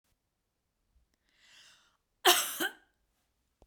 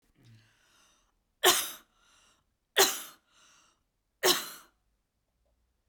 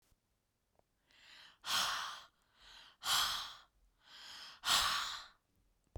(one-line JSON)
{"cough_length": "3.7 s", "cough_amplitude": 12177, "cough_signal_mean_std_ratio": 0.23, "three_cough_length": "5.9 s", "three_cough_amplitude": 14351, "three_cough_signal_mean_std_ratio": 0.25, "exhalation_length": "6.0 s", "exhalation_amplitude": 4255, "exhalation_signal_mean_std_ratio": 0.43, "survey_phase": "beta (2021-08-13 to 2022-03-07)", "age": "18-44", "gender": "Female", "wearing_mask": "No", "symptom_none": true, "smoker_status": "Never smoked", "respiratory_condition_asthma": false, "respiratory_condition_other": false, "recruitment_source": "REACT", "submission_delay": "1 day", "covid_test_result": "Negative", "covid_test_method": "RT-qPCR"}